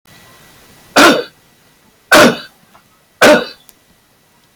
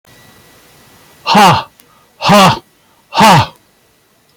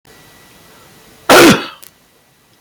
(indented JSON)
{
  "three_cough_length": "4.6 s",
  "three_cough_amplitude": 32768,
  "three_cough_signal_mean_std_ratio": 0.37,
  "exhalation_length": "4.4 s",
  "exhalation_amplitude": 32768,
  "exhalation_signal_mean_std_ratio": 0.45,
  "cough_length": "2.6 s",
  "cough_amplitude": 32768,
  "cough_signal_mean_std_ratio": 0.35,
  "survey_phase": "beta (2021-08-13 to 2022-03-07)",
  "age": "65+",
  "gender": "Male",
  "wearing_mask": "No",
  "symptom_none": true,
  "smoker_status": "Never smoked",
  "respiratory_condition_asthma": false,
  "respiratory_condition_other": false,
  "recruitment_source": "REACT",
  "submission_delay": "2 days",
  "covid_test_result": "Negative",
  "covid_test_method": "RT-qPCR"
}